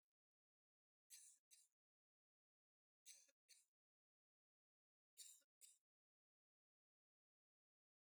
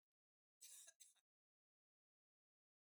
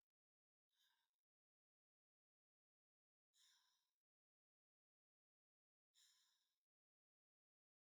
three_cough_length: 8.1 s
three_cough_amplitude: 136
three_cough_signal_mean_std_ratio: 0.26
cough_length: 3.0 s
cough_amplitude: 128
cough_signal_mean_std_ratio: 0.28
exhalation_length: 7.9 s
exhalation_amplitude: 22
exhalation_signal_mean_std_ratio: 0.28
survey_phase: beta (2021-08-13 to 2022-03-07)
age: 65+
gender: Female
wearing_mask: 'No'
symptom_diarrhoea: true
smoker_status: Ex-smoker
respiratory_condition_asthma: false
respiratory_condition_other: false
recruitment_source: REACT
submission_delay: 1 day
covid_test_result: Negative
covid_test_method: RT-qPCR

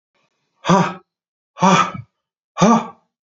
exhalation_length: 3.2 s
exhalation_amplitude: 31585
exhalation_signal_mean_std_ratio: 0.4
survey_phase: beta (2021-08-13 to 2022-03-07)
age: 45-64
gender: Male
wearing_mask: 'No'
symptom_none: true
smoker_status: Ex-smoker
respiratory_condition_asthma: false
respiratory_condition_other: false
recruitment_source: REACT
submission_delay: 1 day
covid_test_result: Negative
covid_test_method: RT-qPCR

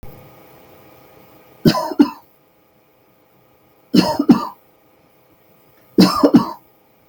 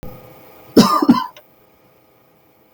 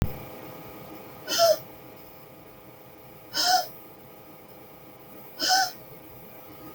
three_cough_length: 7.1 s
three_cough_amplitude: 32768
three_cough_signal_mean_std_ratio: 0.31
cough_length: 2.7 s
cough_amplitude: 32767
cough_signal_mean_std_ratio: 0.33
exhalation_length: 6.7 s
exhalation_amplitude: 10510
exhalation_signal_mean_std_ratio: 0.44
survey_phase: beta (2021-08-13 to 2022-03-07)
age: 65+
gender: Female
wearing_mask: 'No'
symptom_none: true
smoker_status: Never smoked
respiratory_condition_asthma: false
respiratory_condition_other: false
recruitment_source: REACT
submission_delay: 3 days
covid_test_result: Negative
covid_test_method: RT-qPCR
influenza_a_test_result: Negative
influenza_b_test_result: Negative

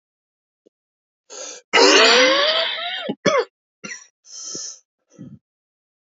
cough_length: 6.1 s
cough_amplitude: 28063
cough_signal_mean_std_ratio: 0.42
survey_phase: beta (2021-08-13 to 2022-03-07)
age: 45-64
gender: Male
wearing_mask: 'No'
symptom_cough_any: true
symptom_runny_or_blocked_nose: true
symptom_shortness_of_breath: true
symptom_sore_throat: true
symptom_fatigue: true
symptom_onset: 2 days
smoker_status: Never smoked
respiratory_condition_asthma: false
respiratory_condition_other: false
recruitment_source: Test and Trace
submission_delay: 1 day
covid_test_result: Positive
covid_test_method: ePCR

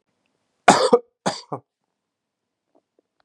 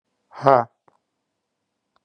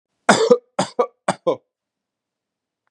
cough_length: 3.2 s
cough_amplitude: 32768
cough_signal_mean_std_ratio: 0.24
exhalation_length: 2.0 s
exhalation_amplitude: 32767
exhalation_signal_mean_std_ratio: 0.2
three_cough_length: 2.9 s
three_cough_amplitude: 32767
three_cough_signal_mean_std_ratio: 0.32
survey_phase: beta (2021-08-13 to 2022-03-07)
age: 45-64
gender: Male
wearing_mask: 'No'
symptom_cough_any: true
symptom_runny_or_blocked_nose: true
symptom_sore_throat: true
symptom_fatigue: true
symptom_fever_high_temperature: true
symptom_headache: true
smoker_status: Never smoked
respiratory_condition_asthma: false
respiratory_condition_other: false
recruitment_source: Test and Trace
submission_delay: 1 day
covid_test_result: Positive
covid_test_method: LFT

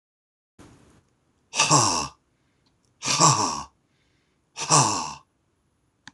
exhalation_length: 6.1 s
exhalation_amplitude: 24332
exhalation_signal_mean_std_ratio: 0.38
survey_phase: alpha (2021-03-01 to 2021-08-12)
age: 45-64
gender: Male
wearing_mask: 'No'
symptom_none: true
smoker_status: Never smoked
respiratory_condition_asthma: false
respiratory_condition_other: false
recruitment_source: REACT
submission_delay: 1 day
covid_test_result: Negative
covid_test_method: RT-qPCR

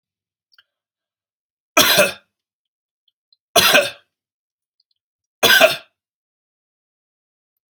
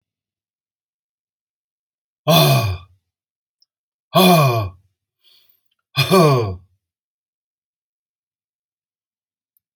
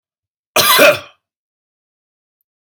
three_cough_length: 7.7 s
three_cough_amplitude: 32768
three_cough_signal_mean_std_ratio: 0.28
exhalation_length: 9.8 s
exhalation_amplitude: 31105
exhalation_signal_mean_std_ratio: 0.32
cough_length: 2.6 s
cough_amplitude: 32768
cough_signal_mean_std_ratio: 0.33
survey_phase: alpha (2021-03-01 to 2021-08-12)
age: 65+
gender: Male
wearing_mask: 'No'
symptom_none: true
smoker_status: Never smoked
respiratory_condition_asthma: false
respiratory_condition_other: false
recruitment_source: REACT
submission_delay: 1 day
covid_test_result: Negative
covid_test_method: RT-qPCR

